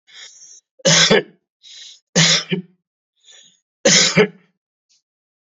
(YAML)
three_cough_length: 5.5 s
three_cough_amplitude: 31607
three_cough_signal_mean_std_ratio: 0.38
survey_phase: beta (2021-08-13 to 2022-03-07)
age: 65+
gender: Male
wearing_mask: 'No'
symptom_none: true
smoker_status: Never smoked
respiratory_condition_asthma: true
respiratory_condition_other: false
recruitment_source: REACT
submission_delay: 4 days
covid_test_result: Positive
covid_test_method: RT-qPCR
covid_ct_value: 33.4
covid_ct_gene: N gene
influenza_a_test_result: Negative
influenza_b_test_result: Negative